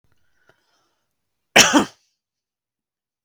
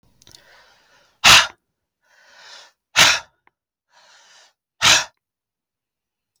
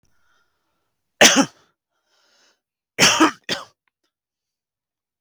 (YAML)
cough_length: 3.2 s
cough_amplitude: 32768
cough_signal_mean_std_ratio: 0.22
exhalation_length: 6.4 s
exhalation_amplitude: 32768
exhalation_signal_mean_std_ratio: 0.25
three_cough_length: 5.2 s
three_cough_amplitude: 32768
three_cough_signal_mean_std_ratio: 0.26
survey_phase: beta (2021-08-13 to 2022-03-07)
age: 18-44
gender: Male
wearing_mask: 'No'
symptom_none: true
smoker_status: Ex-smoker
respiratory_condition_asthma: false
respiratory_condition_other: false
recruitment_source: REACT
submission_delay: 3 days
covid_test_result: Negative
covid_test_method: RT-qPCR
influenza_a_test_result: Unknown/Void
influenza_b_test_result: Unknown/Void